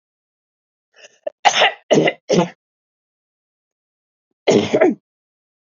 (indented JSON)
{
  "cough_length": "5.6 s",
  "cough_amplitude": 28865,
  "cough_signal_mean_std_ratio": 0.35,
  "survey_phase": "beta (2021-08-13 to 2022-03-07)",
  "age": "18-44",
  "gender": "Female",
  "wearing_mask": "No",
  "symptom_none": true,
  "smoker_status": "Never smoked",
  "respiratory_condition_asthma": false,
  "respiratory_condition_other": false,
  "recruitment_source": "REACT",
  "submission_delay": "1 day",
  "covid_test_result": "Negative",
  "covid_test_method": "RT-qPCR",
  "influenza_a_test_result": "Negative",
  "influenza_b_test_result": "Negative"
}